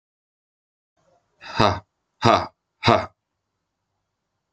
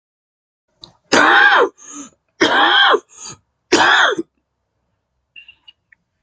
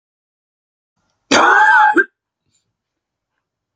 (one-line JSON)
{"exhalation_length": "4.5 s", "exhalation_amplitude": 29008, "exhalation_signal_mean_std_ratio": 0.26, "three_cough_length": "6.2 s", "three_cough_amplitude": 32767, "three_cough_signal_mean_std_ratio": 0.45, "cough_length": "3.8 s", "cough_amplitude": 30687, "cough_signal_mean_std_ratio": 0.37, "survey_phase": "beta (2021-08-13 to 2022-03-07)", "age": "45-64", "gender": "Male", "wearing_mask": "No", "symptom_cough_any": true, "symptom_new_continuous_cough": true, "symptom_runny_or_blocked_nose": true, "symptom_fatigue": true, "symptom_headache": true, "symptom_onset": "2 days", "smoker_status": "Ex-smoker", "respiratory_condition_asthma": false, "respiratory_condition_other": false, "recruitment_source": "Test and Trace", "submission_delay": "2 days", "covid_test_result": "Positive", "covid_test_method": "RT-qPCR", "covid_ct_value": 23.0, "covid_ct_gene": "ORF1ab gene", "covid_ct_mean": 23.4, "covid_viral_load": "21000 copies/ml", "covid_viral_load_category": "Low viral load (10K-1M copies/ml)"}